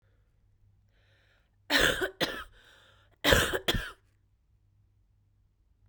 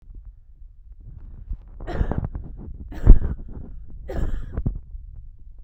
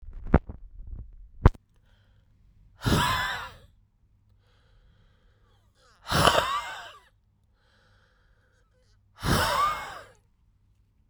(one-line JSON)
{"cough_length": "5.9 s", "cough_amplitude": 19261, "cough_signal_mean_std_ratio": 0.33, "three_cough_length": "5.6 s", "three_cough_amplitude": 32768, "three_cough_signal_mean_std_ratio": 0.36, "exhalation_length": "11.1 s", "exhalation_amplitude": 31824, "exhalation_signal_mean_std_ratio": 0.34, "survey_phase": "beta (2021-08-13 to 2022-03-07)", "age": "18-44", "gender": "Female", "wearing_mask": "No", "symptom_none": true, "smoker_status": "Never smoked", "respiratory_condition_asthma": true, "respiratory_condition_other": false, "recruitment_source": "REACT", "submission_delay": "1 day", "covid_test_result": "Negative", "covid_test_method": "RT-qPCR", "influenza_a_test_result": "Negative", "influenza_b_test_result": "Negative"}